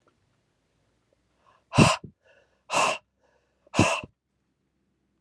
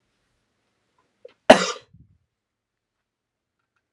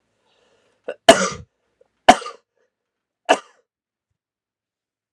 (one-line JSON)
{"exhalation_length": "5.2 s", "exhalation_amplitude": 26948, "exhalation_signal_mean_std_ratio": 0.27, "cough_length": "3.9 s", "cough_amplitude": 32768, "cough_signal_mean_std_ratio": 0.13, "three_cough_length": "5.1 s", "three_cough_amplitude": 32768, "three_cough_signal_mean_std_ratio": 0.18, "survey_phase": "alpha (2021-03-01 to 2021-08-12)", "age": "18-44", "gender": "Male", "wearing_mask": "No", "symptom_cough_any": true, "symptom_new_continuous_cough": true, "symptom_shortness_of_breath": true, "symptom_diarrhoea": true, "symptom_change_to_sense_of_smell_or_taste": true, "symptom_onset": "7 days", "smoker_status": "Never smoked", "respiratory_condition_asthma": false, "respiratory_condition_other": false, "recruitment_source": "Test and Trace", "submission_delay": "2 days", "covid_test_result": "Positive", "covid_test_method": "RT-qPCR", "covid_ct_value": 14.4, "covid_ct_gene": "N gene", "covid_ct_mean": 14.6, "covid_viral_load": "16000000 copies/ml", "covid_viral_load_category": "High viral load (>1M copies/ml)"}